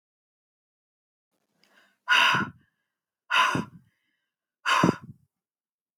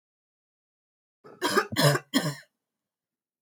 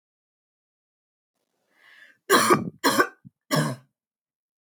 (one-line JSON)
{"exhalation_length": "6.0 s", "exhalation_amplitude": 14042, "exhalation_signal_mean_std_ratio": 0.33, "cough_length": "3.4 s", "cough_amplitude": 12874, "cough_signal_mean_std_ratio": 0.34, "three_cough_length": "4.6 s", "three_cough_amplitude": 20144, "three_cough_signal_mean_std_ratio": 0.32, "survey_phase": "beta (2021-08-13 to 2022-03-07)", "age": "45-64", "gender": "Female", "wearing_mask": "No", "symptom_none": true, "smoker_status": "Never smoked", "respiratory_condition_asthma": false, "respiratory_condition_other": false, "recruitment_source": "REACT", "submission_delay": "1 day", "covid_test_result": "Negative", "covid_test_method": "RT-qPCR", "influenza_a_test_result": "Negative", "influenza_b_test_result": "Negative"}